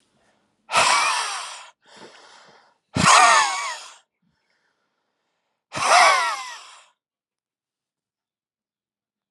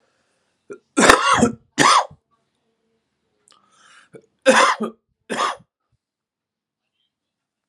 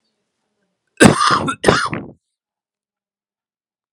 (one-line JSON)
{"exhalation_length": "9.3 s", "exhalation_amplitude": 28471, "exhalation_signal_mean_std_ratio": 0.37, "three_cough_length": "7.7 s", "three_cough_amplitude": 32768, "three_cough_signal_mean_std_ratio": 0.32, "cough_length": "3.9 s", "cough_amplitude": 32768, "cough_signal_mean_std_ratio": 0.32, "survey_phase": "alpha (2021-03-01 to 2021-08-12)", "age": "18-44", "gender": "Male", "wearing_mask": "No", "symptom_cough_any": true, "smoker_status": "Ex-smoker", "respiratory_condition_asthma": false, "respiratory_condition_other": false, "recruitment_source": "Test and Trace", "submission_delay": "2 days", "covid_test_result": "Positive", "covid_test_method": "RT-qPCR", "covid_ct_value": 18.6, "covid_ct_gene": "ORF1ab gene", "covid_ct_mean": 18.7, "covid_viral_load": "720000 copies/ml", "covid_viral_load_category": "Low viral load (10K-1M copies/ml)"}